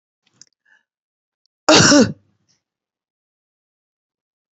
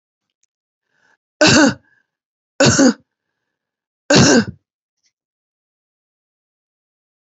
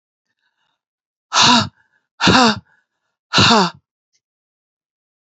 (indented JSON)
{
  "cough_length": "4.5 s",
  "cough_amplitude": 32768,
  "cough_signal_mean_std_ratio": 0.25,
  "three_cough_length": "7.3 s",
  "three_cough_amplitude": 32485,
  "three_cough_signal_mean_std_ratio": 0.31,
  "exhalation_length": "5.3 s",
  "exhalation_amplitude": 32768,
  "exhalation_signal_mean_std_ratio": 0.36,
  "survey_phase": "beta (2021-08-13 to 2022-03-07)",
  "age": "45-64",
  "gender": "Female",
  "wearing_mask": "No",
  "symptom_cough_any": true,
  "symptom_new_continuous_cough": true,
  "symptom_runny_or_blocked_nose": true,
  "symptom_sore_throat": true,
  "symptom_fatigue": true,
  "symptom_headache": true,
  "symptom_change_to_sense_of_smell_or_taste": true,
  "symptom_other": true,
  "symptom_onset": "7 days",
  "smoker_status": "Ex-smoker",
  "respiratory_condition_asthma": false,
  "respiratory_condition_other": false,
  "recruitment_source": "Test and Trace",
  "submission_delay": "2 days",
  "covid_test_result": "Positive",
  "covid_test_method": "RT-qPCR",
  "covid_ct_value": 25.8,
  "covid_ct_gene": "N gene"
}